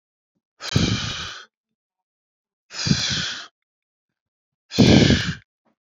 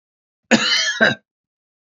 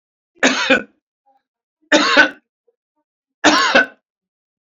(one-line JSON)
{"exhalation_length": "5.9 s", "exhalation_amplitude": 26817, "exhalation_signal_mean_std_ratio": 0.38, "cough_length": "2.0 s", "cough_amplitude": 31693, "cough_signal_mean_std_ratio": 0.42, "three_cough_length": "4.6 s", "three_cough_amplitude": 30752, "three_cough_signal_mean_std_ratio": 0.39, "survey_phase": "alpha (2021-03-01 to 2021-08-12)", "age": "65+", "gender": "Male", "wearing_mask": "No", "symptom_none": true, "smoker_status": "Never smoked", "respiratory_condition_asthma": false, "respiratory_condition_other": false, "recruitment_source": "REACT", "submission_delay": "8 days", "covid_test_result": "Negative", "covid_test_method": "RT-qPCR"}